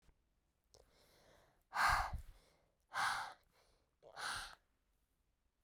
{"exhalation_length": "5.6 s", "exhalation_amplitude": 2380, "exhalation_signal_mean_std_ratio": 0.35, "survey_phase": "beta (2021-08-13 to 2022-03-07)", "age": "18-44", "gender": "Female", "wearing_mask": "No", "symptom_cough_any": true, "symptom_runny_or_blocked_nose": true, "symptom_shortness_of_breath": true, "symptom_sore_throat": true, "symptom_fatigue": true, "symptom_fever_high_temperature": true, "symptom_headache": true, "symptom_change_to_sense_of_smell_or_taste": true, "symptom_other": true, "smoker_status": "Ex-smoker", "respiratory_condition_asthma": false, "respiratory_condition_other": false, "recruitment_source": "Test and Trace", "submission_delay": "2 days", "covid_test_result": "Positive", "covid_test_method": "RT-qPCR", "covid_ct_value": 35.5, "covid_ct_gene": "ORF1ab gene"}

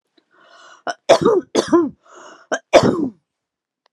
{"three_cough_length": "3.9 s", "three_cough_amplitude": 32768, "three_cough_signal_mean_std_ratio": 0.39, "survey_phase": "alpha (2021-03-01 to 2021-08-12)", "age": "45-64", "gender": "Female", "wearing_mask": "No", "symptom_none": true, "smoker_status": "Never smoked", "respiratory_condition_asthma": false, "respiratory_condition_other": false, "recruitment_source": "REACT", "submission_delay": "2 days", "covid_test_result": "Negative", "covid_test_method": "RT-qPCR"}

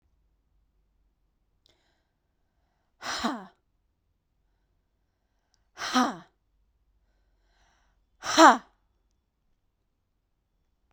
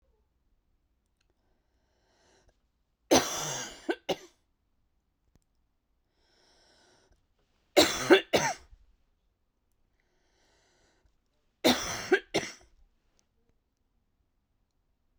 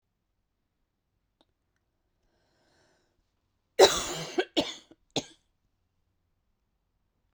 {"exhalation_length": "10.9 s", "exhalation_amplitude": 28234, "exhalation_signal_mean_std_ratio": 0.17, "three_cough_length": "15.2 s", "three_cough_amplitude": 18033, "three_cough_signal_mean_std_ratio": 0.23, "cough_length": "7.3 s", "cough_amplitude": 19637, "cough_signal_mean_std_ratio": 0.18, "survey_phase": "beta (2021-08-13 to 2022-03-07)", "age": "18-44", "gender": "Female", "wearing_mask": "No", "symptom_cough_any": true, "symptom_runny_or_blocked_nose": true, "symptom_sore_throat": true, "symptom_fatigue": true, "symptom_onset": "6 days", "smoker_status": "Never smoked", "respiratory_condition_asthma": false, "respiratory_condition_other": false, "recruitment_source": "Test and Trace", "submission_delay": "2 days", "covid_test_result": "Positive", "covid_test_method": "RT-qPCR", "covid_ct_value": 28.4, "covid_ct_gene": "ORF1ab gene"}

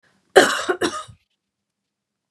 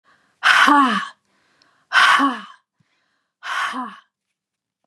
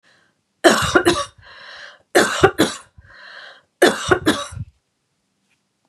{"cough_length": "2.3 s", "cough_amplitude": 32768, "cough_signal_mean_std_ratio": 0.3, "exhalation_length": "4.9 s", "exhalation_amplitude": 32757, "exhalation_signal_mean_std_ratio": 0.42, "three_cough_length": "5.9 s", "three_cough_amplitude": 32768, "three_cough_signal_mean_std_ratio": 0.39, "survey_phase": "beta (2021-08-13 to 2022-03-07)", "age": "45-64", "gender": "Female", "wearing_mask": "No", "symptom_none": true, "smoker_status": "Never smoked", "respiratory_condition_asthma": false, "respiratory_condition_other": false, "recruitment_source": "REACT", "submission_delay": "1 day", "covid_test_result": "Negative", "covid_test_method": "RT-qPCR", "influenza_a_test_result": "Negative", "influenza_b_test_result": "Negative"}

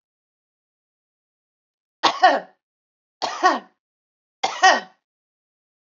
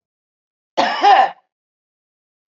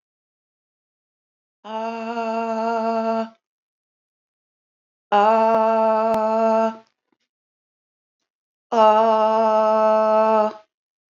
{"three_cough_length": "5.9 s", "three_cough_amplitude": 32416, "three_cough_signal_mean_std_ratio": 0.27, "cough_length": "2.5 s", "cough_amplitude": 31244, "cough_signal_mean_std_ratio": 0.35, "exhalation_length": "11.2 s", "exhalation_amplitude": 21574, "exhalation_signal_mean_std_ratio": 0.53, "survey_phase": "beta (2021-08-13 to 2022-03-07)", "age": "45-64", "gender": "Female", "wearing_mask": "No", "symptom_none": true, "smoker_status": "Ex-smoker", "respiratory_condition_asthma": false, "respiratory_condition_other": false, "recruitment_source": "REACT", "submission_delay": "2 days", "covid_test_result": "Negative", "covid_test_method": "RT-qPCR", "influenza_a_test_result": "Negative", "influenza_b_test_result": "Negative"}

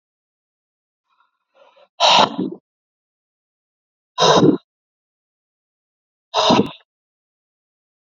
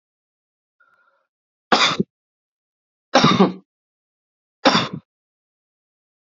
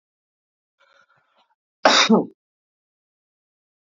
{"exhalation_length": "8.1 s", "exhalation_amplitude": 28334, "exhalation_signal_mean_std_ratio": 0.29, "three_cough_length": "6.4 s", "three_cough_amplitude": 28896, "three_cough_signal_mean_std_ratio": 0.28, "cough_length": "3.8 s", "cough_amplitude": 26766, "cough_signal_mean_std_ratio": 0.25, "survey_phase": "beta (2021-08-13 to 2022-03-07)", "age": "18-44", "gender": "Male", "wearing_mask": "No", "symptom_cough_any": true, "symptom_runny_or_blocked_nose": true, "symptom_sore_throat": true, "symptom_fatigue": true, "symptom_headache": true, "symptom_change_to_sense_of_smell_or_taste": true, "symptom_loss_of_taste": true, "symptom_onset": "4 days", "smoker_status": "Never smoked", "respiratory_condition_asthma": false, "respiratory_condition_other": false, "recruitment_source": "Test and Trace", "submission_delay": "2 days", "covid_test_result": "Positive", "covid_test_method": "RT-qPCR"}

